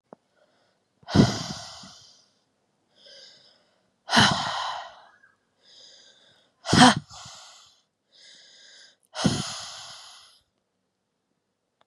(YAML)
exhalation_length: 11.9 s
exhalation_amplitude: 32185
exhalation_signal_mean_std_ratio: 0.27
survey_phase: beta (2021-08-13 to 2022-03-07)
age: 18-44
gender: Female
wearing_mask: 'No'
symptom_cough_any: true
symptom_new_continuous_cough: true
symptom_runny_or_blocked_nose: true
symptom_sore_throat: true
symptom_fatigue: true
symptom_headache: true
symptom_change_to_sense_of_smell_or_taste: true
symptom_loss_of_taste: true
symptom_other: true
symptom_onset: 8 days
smoker_status: Never smoked
respiratory_condition_asthma: false
respiratory_condition_other: false
recruitment_source: Test and Trace
submission_delay: 2 days
covid_test_result: Positive
covid_test_method: RT-qPCR
covid_ct_value: 17.4
covid_ct_gene: N gene